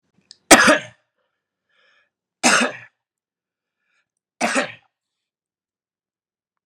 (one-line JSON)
{"three_cough_length": "6.7 s", "three_cough_amplitude": 32768, "three_cough_signal_mean_std_ratio": 0.24, "survey_phase": "beta (2021-08-13 to 2022-03-07)", "age": "45-64", "gender": "Male", "wearing_mask": "No", "symptom_cough_any": true, "symptom_runny_or_blocked_nose": true, "symptom_onset": "3 days", "smoker_status": "Never smoked", "respiratory_condition_asthma": false, "respiratory_condition_other": false, "recruitment_source": "Test and Trace", "submission_delay": "2 days", "covid_test_result": "Positive", "covid_test_method": "RT-qPCR", "covid_ct_value": 21.1, "covid_ct_gene": "N gene", "covid_ct_mean": 21.3, "covid_viral_load": "110000 copies/ml", "covid_viral_load_category": "Low viral load (10K-1M copies/ml)"}